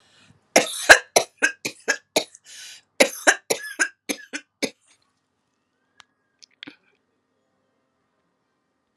{"cough_length": "9.0 s", "cough_amplitude": 32768, "cough_signal_mean_std_ratio": 0.23, "survey_phase": "alpha (2021-03-01 to 2021-08-12)", "age": "65+", "gender": "Female", "wearing_mask": "No", "symptom_cough_any": true, "symptom_fatigue": true, "symptom_headache": true, "smoker_status": "Ex-smoker", "respiratory_condition_asthma": false, "respiratory_condition_other": false, "recruitment_source": "Test and Trace", "submission_delay": "2 days", "covid_test_result": "Positive", "covid_test_method": "RT-qPCR", "covid_ct_value": 33.9, "covid_ct_gene": "N gene"}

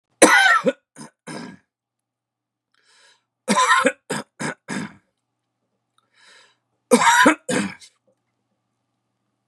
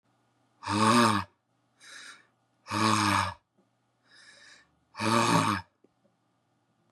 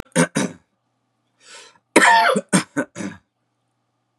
{"three_cough_length": "9.5 s", "three_cough_amplitude": 32768, "three_cough_signal_mean_std_ratio": 0.34, "exhalation_length": "6.9 s", "exhalation_amplitude": 11450, "exhalation_signal_mean_std_ratio": 0.42, "cough_length": "4.2 s", "cough_amplitude": 32768, "cough_signal_mean_std_ratio": 0.37, "survey_phase": "beta (2021-08-13 to 2022-03-07)", "age": "45-64", "gender": "Male", "wearing_mask": "No", "symptom_none": true, "smoker_status": "Never smoked", "respiratory_condition_asthma": false, "respiratory_condition_other": false, "recruitment_source": "REACT", "submission_delay": "3 days", "covid_test_result": "Negative", "covid_test_method": "RT-qPCR", "influenza_a_test_result": "Negative", "influenza_b_test_result": "Negative"}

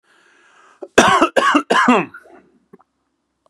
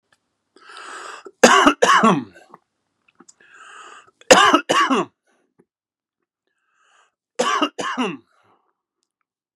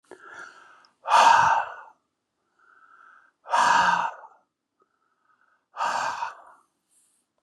{"cough_length": "3.5 s", "cough_amplitude": 32768, "cough_signal_mean_std_ratio": 0.41, "three_cough_length": "9.6 s", "three_cough_amplitude": 32768, "three_cough_signal_mean_std_ratio": 0.34, "exhalation_length": "7.4 s", "exhalation_amplitude": 17224, "exhalation_signal_mean_std_ratio": 0.38, "survey_phase": "beta (2021-08-13 to 2022-03-07)", "age": "45-64", "gender": "Male", "wearing_mask": "No", "symptom_none": true, "smoker_status": "Never smoked", "respiratory_condition_asthma": false, "respiratory_condition_other": false, "recruitment_source": "REACT", "submission_delay": "1 day", "covid_test_result": "Negative", "covid_test_method": "RT-qPCR", "influenza_a_test_result": "Negative", "influenza_b_test_result": "Negative"}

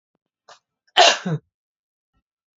{"cough_length": "2.6 s", "cough_amplitude": 32767, "cough_signal_mean_std_ratio": 0.25, "survey_phase": "beta (2021-08-13 to 2022-03-07)", "age": "18-44", "gender": "Male", "wearing_mask": "No", "symptom_runny_or_blocked_nose": true, "symptom_shortness_of_breath": true, "symptom_fatigue": true, "symptom_headache": true, "smoker_status": "Ex-smoker", "respiratory_condition_asthma": false, "respiratory_condition_other": false, "recruitment_source": "Test and Trace", "submission_delay": "2 days", "covid_test_result": "Positive", "covid_test_method": "RT-qPCR", "covid_ct_value": 19.3, "covid_ct_gene": "ORF1ab gene", "covid_ct_mean": 20.5, "covid_viral_load": "190000 copies/ml", "covid_viral_load_category": "Low viral load (10K-1M copies/ml)"}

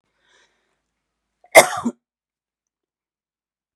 {"cough_length": "3.8 s", "cough_amplitude": 32768, "cough_signal_mean_std_ratio": 0.16, "survey_phase": "beta (2021-08-13 to 2022-03-07)", "age": "45-64", "gender": "Female", "wearing_mask": "No", "symptom_none": true, "smoker_status": "Ex-smoker", "respiratory_condition_asthma": false, "respiratory_condition_other": false, "recruitment_source": "REACT", "submission_delay": "6 days", "covid_test_result": "Negative", "covid_test_method": "RT-qPCR", "influenza_a_test_result": "Negative", "influenza_b_test_result": "Negative"}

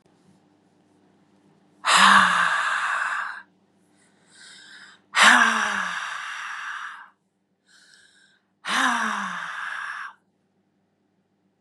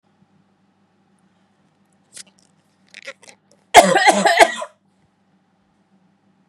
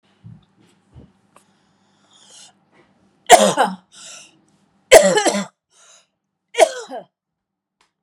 {"exhalation_length": "11.6 s", "exhalation_amplitude": 27367, "exhalation_signal_mean_std_ratio": 0.43, "cough_length": "6.5 s", "cough_amplitude": 32768, "cough_signal_mean_std_ratio": 0.25, "three_cough_length": "8.0 s", "three_cough_amplitude": 32768, "three_cough_signal_mean_std_ratio": 0.26, "survey_phase": "beta (2021-08-13 to 2022-03-07)", "age": "45-64", "gender": "Female", "wearing_mask": "No", "symptom_none": true, "smoker_status": "Ex-smoker", "respiratory_condition_asthma": false, "respiratory_condition_other": false, "recruitment_source": "REACT", "submission_delay": "1 day", "covid_test_result": "Negative", "covid_test_method": "RT-qPCR", "influenza_a_test_result": "Negative", "influenza_b_test_result": "Negative"}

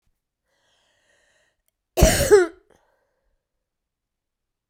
{"cough_length": "4.7 s", "cough_amplitude": 32767, "cough_signal_mean_std_ratio": 0.24, "survey_phase": "beta (2021-08-13 to 2022-03-07)", "age": "65+", "gender": "Female", "wearing_mask": "No", "symptom_cough_any": true, "symptom_runny_or_blocked_nose": true, "symptom_sore_throat": true, "symptom_fatigue": true, "symptom_change_to_sense_of_smell_or_taste": true, "symptom_loss_of_taste": true, "symptom_onset": "6 days", "smoker_status": "Never smoked", "respiratory_condition_asthma": false, "respiratory_condition_other": true, "recruitment_source": "Test and Trace", "submission_delay": "2 days", "covid_test_result": "Positive", "covid_test_method": "RT-qPCR", "covid_ct_value": 14.8, "covid_ct_gene": "S gene", "covid_ct_mean": 15.2, "covid_viral_load": "10000000 copies/ml", "covid_viral_load_category": "High viral load (>1M copies/ml)"}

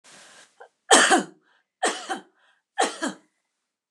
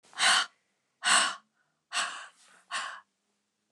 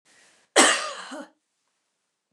{"three_cough_length": "3.9 s", "three_cough_amplitude": 29203, "three_cough_signal_mean_std_ratio": 0.33, "exhalation_length": "3.7 s", "exhalation_amplitude": 11529, "exhalation_signal_mean_std_ratio": 0.39, "cough_length": "2.3 s", "cough_amplitude": 27476, "cough_signal_mean_std_ratio": 0.3, "survey_phase": "beta (2021-08-13 to 2022-03-07)", "age": "65+", "gender": "Female", "wearing_mask": "No", "symptom_none": true, "smoker_status": "Never smoked", "respiratory_condition_asthma": false, "respiratory_condition_other": false, "recruitment_source": "REACT", "submission_delay": "2 days", "covid_test_result": "Negative", "covid_test_method": "RT-qPCR"}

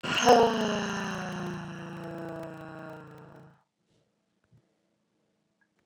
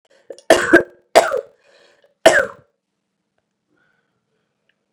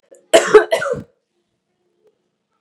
{"exhalation_length": "5.9 s", "exhalation_amplitude": 16448, "exhalation_signal_mean_std_ratio": 0.38, "three_cough_length": "4.9 s", "three_cough_amplitude": 32768, "three_cough_signal_mean_std_ratio": 0.27, "cough_length": "2.6 s", "cough_amplitude": 32768, "cough_signal_mean_std_ratio": 0.3, "survey_phase": "beta (2021-08-13 to 2022-03-07)", "age": "18-44", "gender": "Female", "wearing_mask": "Yes", "symptom_cough_any": true, "symptom_runny_or_blocked_nose": true, "symptom_headache": true, "symptom_change_to_sense_of_smell_or_taste": true, "symptom_loss_of_taste": true, "smoker_status": "Ex-smoker", "respiratory_condition_asthma": false, "respiratory_condition_other": false, "recruitment_source": "Test and Trace", "submission_delay": "1 day", "covid_test_result": "Positive", "covid_test_method": "RT-qPCR", "covid_ct_value": 13.0, "covid_ct_gene": "ORF1ab gene"}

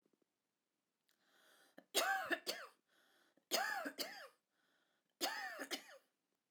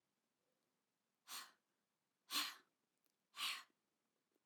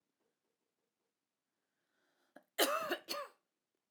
{"three_cough_length": "6.5 s", "three_cough_amplitude": 2505, "three_cough_signal_mean_std_ratio": 0.4, "exhalation_length": "4.5 s", "exhalation_amplitude": 1212, "exhalation_signal_mean_std_ratio": 0.29, "cough_length": "3.9 s", "cough_amplitude": 5133, "cough_signal_mean_std_ratio": 0.27, "survey_phase": "alpha (2021-03-01 to 2021-08-12)", "age": "45-64", "gender": "Female", "wearing_mask": "No", "symptom_none": true, "smoker_status": "Never smoked", "respiratory_condition_asthma": false, "respiratory_condition_other": false, "recruitment_source": "REACT", "submission_delay": "2 days", "covid_test_result": "Negative", "covid_test_method": "RT-qPCR"}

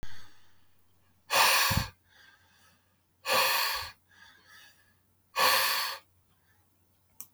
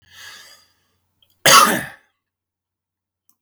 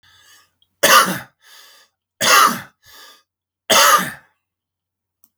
{"exhalation_length": "7.3 s", "exhalation_amplitude": 10062, "exhalation_signal_mean_std_ratio": 0.45, "cough_length": "3.4 s", "cough_amplitude": 32768, "cough_signal_mean_std_ratio": 0.26, "three_cough_length": "5.4 s", "three_cough_amplitude": 32768, "three_cough_signal_mean_std_ratio": 0.36, "survey_phase": "beta (2021-08-13 to 2022-03-07)", "age": "65+", "gender": "Male", "wearing_mask": "No", "symptom_none": true, "smoker_status": "Never smoked", "respiratory_condition_asthma": false, "respiratory_condition_other": false, "recruitment_source": "REACT", "submission_delay": "1 day", "covid_test_result": "Negative", "covid_test_method": "RT-qPCR", "influenza_a_test_result": "Negative", "influenza_b_test_result": "Negative"}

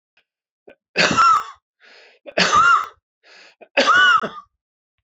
{"three_cough_length": "5.0 s", "three_cough_amplitude": 23515, "three_cough_signal_mean_std_ratio": 0.48, "survey_phase": "beta (2021-08-13 to 2022-03-07)", "age": "45-64", "gender": "Male", "wearing_mask": "No", "symptom_cough_any": true, "symptom_sore_throat": true, "symptom_fatigue": true, "symptom_headache": true, "smoker_status": "Ex-smoker", "respiratory_condition_asthma": false, "respiratory_condition_other": false, "recruitment_source": "Test and Trace", "submission_delay": "2 days", "covid_test_result": "Positive", "covid_test_method": "RT-qPCR"}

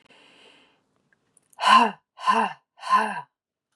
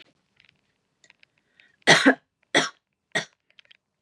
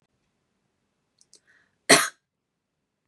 {"exhalation_length": "3.8 s", "exhalation_amplitude": 20893, "exhalation_signal_mean_std_ratio": 0.37, "three_cough_length": "4.0 s", "three_cough_amplitude": 25649, "three_cough_signal_mean_std_ratio": 0.24, "cough_length": "3.1 s", "cough_amplitude": 30941, "cough_signal_mean_std_ratio": 0.17, "survey_phase": "beta (2021-08-13 to 2022-03-07)", "age": "18-44", "gender": "Female", "wearing_mask": "No", "symptom_none": true, "smoker_status": "Never smoked", "respiratory_condition_asthma": false, "respiratory_condition_other": false, "recruitment_source": "REACT", "submission_delay": "1 day", "covid_test_result": "Negative", "covid_test_method": "RT-qPCR", "influenza_a_test_result": "Negative", "influenza_b_test_result": "Negative"}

